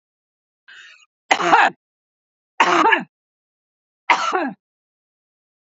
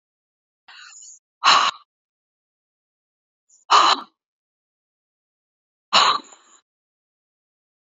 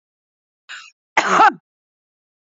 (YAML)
three_cough_length: 5.7 s
three_cough_amplitude: 32768
three_cough_signal_mean_std_ratio: 0.34
exhalation_length: 7.9 s
exhalation_amplitude: 29183
exhalation_signal_mean_std_ratio: 0.26
cough_length: 2.5 s
cough_amplitude: 28328
cough_signal_mean_std_ratio: 0.29
survey_phase: beta (2021-08-13 to 2022-03-07)
age: 45-64
gender: Female
wearing_mask: 'No'
symptom_fatigue: true
smoker_status: Current smoker (e-cigarettes or vapes only)
respiratory_condition_asthma: false
respiratory_condition_other: false
recruitment_source: REACT
submission_delay: 1 day
covid_test_result: Negative
covid_test_method: RT-qPCR
influenza_a_test_result: Negative
influenza_b_test_result: Negative